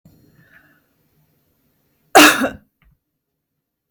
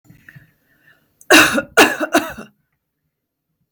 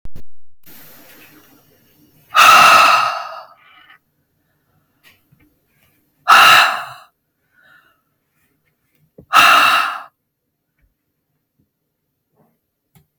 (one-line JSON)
{"cough_length": "3.9 s", "cough_amplitude": 32768, "cough_signal_mean_std_ratio": 0.23, "three_cough_length": "3.7 s", "three_cough_amplitude": 32768, "three_cough_signal_mean_std_ratio": 0.33, "exhalation_length": "13.2 s", "exhalation_amplitude": 32768, "exhalation_signal_mean_std_ratio": 0.35, "survey_phase": "beta (2021-08-13 to 2022-03-07)", "age": "18-44", "gender": "Female", "wearing_mask": "No", "symptom_none": true, "smoker_status": "Never smoked", "respiratory_condition_asthma": false, "respiratory_condition_other": false, "recruitment_source": "REACT", "submission_delay": "2 days", "covid_test_result": "Negative", "covid_test_method": "RT-qPCR"}